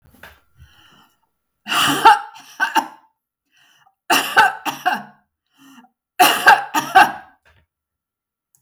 {
  "three_cough_length": "8.6 s",
  "three_cough_amplitude": 32768,
  "three_cough_signal_mean_std_ratio": 0.35,
  "survey_phase": "beta (2021-08-13 to 2022-03-07)",
  "age": "45-64",
  "gender": "Female",
  "wearing_mask": "No",
  "symptom_none": true,
  "smoker_status": "Never smoked",
  "respiratory_condition_asthma": false,
  "respiratory_condition_other": false,
  "recruitment_source": "REACT",
  "submission_delay": "1 day",
  "covid_test_result": "Negative",
  "covid_test_method": "RT-qPCR"
}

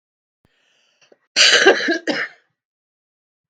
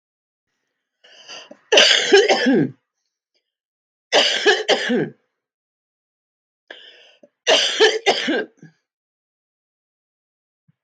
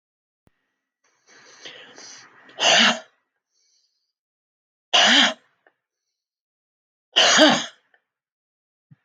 {
  "cough_length": "3.5 s",
  "cough_amplitude": 32768,
  "cough_signal_mean_std_ratio": 0.35,
  "three_cough_length": "10.8 s",
  "three_cough_amplitude": 32768,
  "three_cough_signal_mean_std_ratio": 0.39,
  "exhalation_length": "9.0 s",
  "exhalation_amplitude": 32766,
  "exhalation_signal_mean_std_ratio": 0.3,
  "survey_phase": "beta (2021-08-13 to 2022-03-07)",
  "age": "45-64",
  "gender": "Female",
  "wearing_mask": "No",
  "symptom_cough_any": true,
  "symptom_runny_or_blocked_nose": true,
  "symptom_sore_throat": true,
  "symptom_diarrhoea": true,
  "symptom_headache": true,
  "symptom_other": true,
  "symptom_onset": "3 days",
  "smoker_status": "Ex-smoker",
  "respiratory_condition_asthma": false,
  "respiratory_condition_other": false,
  "recruitment_source": "Test and Trace",
  "submission_delay": "1 day",
  "covid_test_result": "Positive",
  "covid_test_method": "ePCR"
}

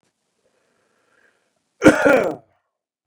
{
  "cough_length": "3.1 s",
  "cough_amplitude": 32768,
  "cough_signal_mean_std_ratio": 0.28,
  "survey_phase": "beta (2021-08-13 to 2022-03-07)",
  "age": "45-64",
  "gender": "Male",
  "wearing_mask": "No",
  "symptom_cough_any": true,
  "symptom_runny_or_blocked_nose": true,
  "symptom_sore_throat": true,
  "symptom_fatigue": true,
  "symptom_headache": true,
  "symptom_change_to_sense_of_smell_or_taste": true,
  "symptom_loss_of_taste": true,
  "symptom_onset": "5 days",
  "smoker_status": "Ex-smoker",
  "respiratory_condition_asthma": false,
  "respiratory_condition_other": false,
  "recruitment_source": "Test and Trace",
  "submission_delay": "1 day",
  "covid_test_result": "Positive",
  "covid_test_method": "RT-qPCR",
  "covid_ct_value": 15.8,
  "covid_ct_gene": "ORF1ab gene",
  "covid_ct_mean": 16.3,
  "covid_viral_load": "4400000 copies/ml",
  "covid_viral_load_category": "High viral load (>1M copies/ml)"
}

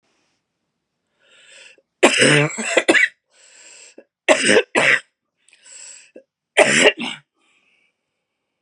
{
  "three_cough_length": "8.6 s",
  "three_cough_amplitude": 32768,
  "three_cough_signal_mean_std_ratio": 0.37,
  "survey_phase": "beta (2021-08-13 to 2022-03-07)",
  "age": "45-64",
  "gender": "Female",
  "wearing_mask": "No",
  "symptom_cough_any": true,
  "symptom_runny_or_blocked_nose": true,
  "symptom_shortness_of_breath": true,
  "symptom_sore_throat": true,
  "symptom_fatigue": true,
  "symptom_fever_high_temperature": true,
  "symptom_headache": true,
  "symptom_other": true,
  "symptom_onset": "3 days",
  "smoker_status": "Never smoked",
  "respiratory_condition_asthma": false,
  "respiratory_condition_other": false,
  "recruitment_source": "Test and Trace",
  "submission_delay": "2 days",
  "covid_test_result": "Positive",
  "covid_test_method": "RT-qPCR",
  "covid_ct_value": 15.2,
  "covid_ct_gene": "ORF1ab gene"
}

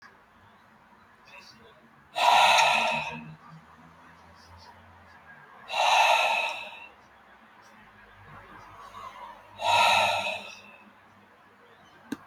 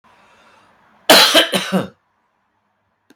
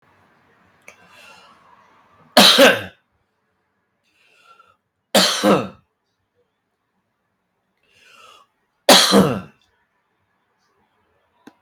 {
  "exhalation_length": "12.3 s",
  "exhalation_amplitude": 15350,
  "exhalation_signal_mean_std_ratio": 0.42,
  "cough_length": "3.2 s",
  "cough_amplitude": 32768,
  "cough_signal_mean_std_ratio": 0.35,
  "three_cough_length": "11.6 s",
  "three_cough_amplitude": 32768,
  "three_cough_signal_mean_std_ratio": 0.27,
  "survey_phase": "beta (2021-08-13 to 2022-03-07)",
  "age": "45-64",
  "gender": "Male",
  "wearing_mask": "No",
  "symptom_none": true,
  "smoker_status": "Ex-smoker",
  "respiratory_condition_asthma": false,
  "respiratory_condition_other": false,
  "recruitment_source": "REACT",
  "submission_delay": "3 days",
  "covid_test_result": "Negative",
  "covid_test_method": "RT-qPCR"
}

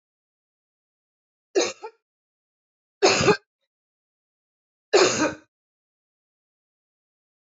{
  "three_cough_length": "7.6 s",
  "three_cough_amplitude": 19602,
  "three_cough_signal_mean_std_ratio": 0.26,
  "survey_phase": "beta (2021-08-13 to 2022-03-07)",
  "age": "45-64",
  "gender": "Female",
  "wearing_mask": "No",
  "symptom_none": true,
  "smoker_status": "Ex-smoker",
  "respiratory_condition_asthma": false,
  "respiratory_condition_other": false,
  "recruitment_source": "REACT",
  "submission_delay": "3 days",
  "covid_test_result": "Negative",
  "covid_test_method": "RT-qPCR",
  "influenza_a_test_result": "Negative",
  "influenza_b_test_result": "Negative"
}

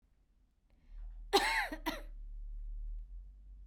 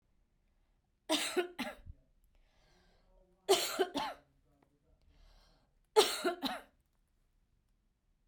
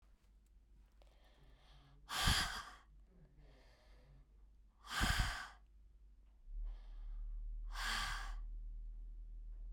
{
  "cough_length": "3.7 s",
  "cough_amplitude": 6992,
  "cough_signal_mean_std_ratio": 0.58,
  "three_cough_length": "8.3 s",
  "three_cough_amplitude": 9226,
  "three_cough_signal_mean_std_ratio": 0.31,
  "exhalation_length": "9.7 s",
  "exhalation_amplitude": 2746,
  "exhalation_signal_mean_std_ratio": 0.59,
  "survey_phase": "beta (2021-08-13 to 2022-03-07)",
  "age": "45-64",
  "gender": "Female",
  "wearing_mask": "No",
  "symptom_none": true,
  "smoker_status": "Never smoked",
  "respiratory_condition_asthma": false,
  "respiratory_condition_other": false,
  "recruitment_source": "REACT",
  "submission_delay": "1 day",
  "covid_test_result": "Negative",
  "covid_test_method": "RT-qPCR"
}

